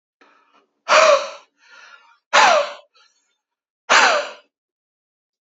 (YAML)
exhalation_length: 5.5 s
exhalation_amplitude: 31068
exhalation_signal_mean_std_ratio: 0.36
survey_phase: beta (2021-08-13 to 2022-03-07)
age: 18-44
gender: Male
wearing_mask: 'No'
symptom_none: true
smoker_status: Ex-smoker
respiratory_condition_asthma: false
respiratory_condition_other: false
recruitment_source: Test and Trace
submission_delay: 2 days
covid_test_result: Positive
covid_test_method: RT-qPCR
covid_ct_value: 25.2
covid_ct_gene: ORF1ab gene
covid_ct_mean: 25.5
covid_viral_load: 4200 copies/ml
covid_viral_load_category: Minimal viral load (< 10K copies/ml)